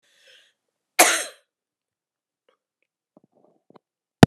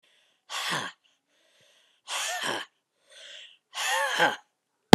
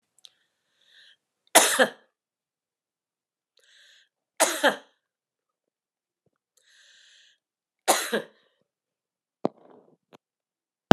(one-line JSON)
{"cough_length": "4.3 s", "cough_amplitude": 32768, "cough_signal_mean_std_ratio": 0.15, "exhalation_length": "4.9 s", "exhalation_amplitude": 32768, "exhalation_signal_mean_std_ratio": 0.25, "three_cough_length": "10.9 s", "three_cough_amplitude": 32768, "three_cough_signal_mean_std_ratio": 0.18, "survey_phase": "beta (2021-08-13 to 2022-03-07)", "age": "65+", "gender": "Female", "wearing_mask": "No", "symptom_cough_any": true, "symptom_headache": true, "symptom_other": true, "smoker_status": "Never smoked", "respiratory_condition_asthma": true, "respiratory_condition_other": false, "recruitment_source": "Test and Trace", "submission_delay": "1 day", "covid_test_result": "Positive", "covid_test_method": "RT-qPCR", "covid_ct_value": 15.2, "covid_ct_gene": "ORF1ab gene", "covid_ct_mean": 15.5, "covid_viral_load": "8200000 copies/ml", "covid_viral_load_category": "High viral load (>1M copies/ml)"}